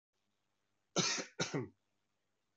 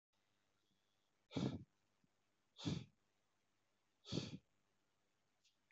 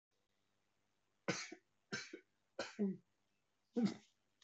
cough_length: 2.6 s
cough_amplitude: 4016
cough_signal_mean_std_ratio: 0.35
exhalation_length: 5.7 s
exhalation_amplitude: 1303
exhalation_signal_mean_std_ratio: 0.29
three_cough_length: 4.4 s
three_cough_amplitude: 2075
three_cough_signal_mean_std_ratio: 0.33
survey_phase: beta (2021-08-13 to 2022-03-07)
age: 45-64
gender: Male
wearing_mask: 'No'
symptom_none: true
smoker_status: Never smoked
respiratory_condition_asthma: false
respiratory_condition_other: false
recruitment_source: Test and Trace
submission_delay: 0 days
covid_test_result: Negative
covid_test_method: LFT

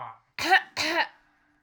cough_length: 1.6 s
cough_amplitude: 14071
cough_signal_mean_std_ratio: 0.45
survey_phase: alpha (2021-03-01 to 2021-08-12)
age: 18-44
gender: Female
wearing_mask: 'No'
symptom_none: true
smoker_status: Never smoked
respiratory_condition_asthma: true
respiratory_condition_other: false
recruitment_source: REACT
submission_delay: 3 days
covid_test_result: Negative
covid_test_method: RT-qPCR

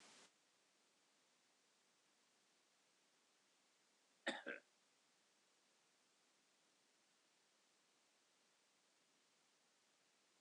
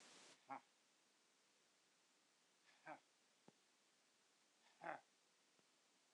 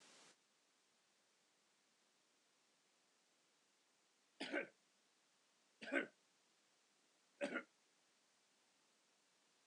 cough_length: 10.4 s
cough_amplitude: 938
cough_signal_mean_std_ratio: 0.24
exhalation_length: 6.1 s
exhalation_amplitude: 614
exhalation_signal_mean_std_ratio: 0.35
three_cough_length: 9.7 s
three_cough_amplitude: 1701
three_cough_signal_mean_std_ratio: 0.24
survey_phase: beta (2021-08-13 to 2022-03-07)
age: 65+
gender: Male
wearing_mask: 'No'
symptom_none: true
smoker_status: Ex-smoker
respiratory_condition_asthma: false
respiratory_condition_other: false
recruitment_source: REACT
submission_delay: 0 days
covid_test_result: Negative
covid_test_method: RT-qPCR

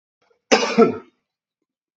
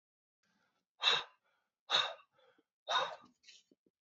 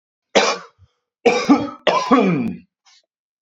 cough_length: 2.0 s
cough_amplitude: 27179
cough_signal_mean_std_ratio: 0.33
exhalation_length: 4.0 s
exhalation_amplitude: 6498
exhalation_signal_mean_std_ratio: 0.32
three_cough_length: 3.4 s
three_cough_amplitude: 29238
three_cough_signal_mean_std_ratio: 0.49
survey_phase: beta (2021-08-13 to 2022-03-07)
age: 18-44
gender: Male
wearing_mask: 'No'
symptom_cough_any: true
symptom_sore_throat: true
symptom_fatigue: true
symptom_headache: true
smoker_status: Never smoked
respiratory_condition_asthma: false
respiratory_condition_other: false
recruitment_source: Test and Trace
submission_delay: 1 day
covid_test_result: Positive
covid_test_method: LFT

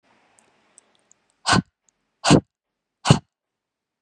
exhalation_length: 4.0 s
exhalation_amplitude: 32016
exhalation_signal_mean_std_ratio: 0.23
survey_phase: beta (2021-08-13 to 2022-03-07)
age: 18-44
gender: Female
wearing_mask: 'No'
symptom_none: true
symptom_onset: 8 days
smoker_status: Never smoked
respiratory_condition_asthma: false
respiratory_condition_other: false
recruitment_source: REACT
submission_delay: 4 days
covid_test_result: Negative
covid_test_method: RT-qPCR
influenza_a_test_result: Negative
influenza_b_test_result: Negative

